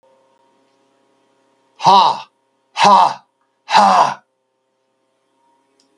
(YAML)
exhalation_length: 6.0 s
exhalation_amplitude: 32768
exhalation_signal_mean_std_ratio: 0.35
survey_phase: beta (2021-08-13 to 2022-03-07)
age: 65+
gender: Male
wearing_mask: 'No'
symptom_none: true
symptom_onset: 12 days
smoker_status: Never smoked
respiratory_condition_asthma: false
respiratory_condition_other: false
recruitment_source: REACT
submission_delay: 3 days
covid_test_result: Negative
covid_test_method: RT-qPCR
influenza_a_test_result: Negative
influenza_b_test_result: Negative